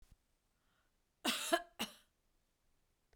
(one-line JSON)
{"cough_length": "3.2 s", "cough_amplitude": 4121, "cough_signal_mean_std_ratio": 0.28, "survey_phase": "beta (2021-08-13 to 2022-03-07)", "age": "65+", "gender": "Female", "wearing_mask": "No", "symptom_none": true, "smoker_status": "Ex-smoker", "respiratory_condition_asthma": false, "respiratory_condition_other": false, "recruitment_source": "REACT", "submission_delay": "3 days", "covid_test_result": "Negative", "covid_test_method": "RT-qPCR"}